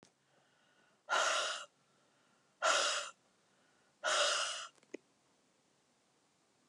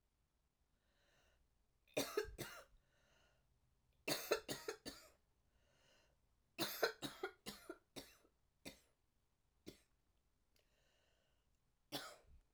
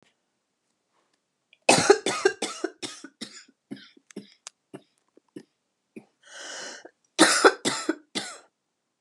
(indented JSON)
{
  "exhalation_length": "6.7 s",
  "exhalation_amplitude": 4213,
  "exhalation_signal_mean_std_ratio": 0.41,
  "three_cough_length": "12.5 s",
  "three_cough_amplitude": 2878,
  "three_cough_signal_mean_std_ratio": 0.3,
  "cough_length": "9.0 s",
  "cough_amplitude": 28124,
  "cough_signal_mean_std_ratio": 0.28,
  "survey_phase": "alpha (2021-03-01 to 2021-08-12)",
  "age": "45-64",
  "gender": "Female",
  "wearing_mask": "No",
  "symptom_cough_any": true,
  "symptom_headache": true,
  "symptom_onset": "2 days",
  "smoker_status": "Ex-smoker",
  "respiratory_condition_asthma": false,
  "respiratory_condition_other": false,
  "recruitment_source": "Test and Trace",
  "submission_delay": "1 day",
  "covid_test_result": "Positive",
  "covid_test_method": "RT-qPCR",
  "covid_ct_value": 23.0,
  "covid_ct_gene": "ORF1ab gene",
  "covid_ct_mean": 23.2,
  "covid_viral_load": "24000 copies/ml",
  "covid_viral_load_category": "Low viral load (10K-1M copies/ml)"
}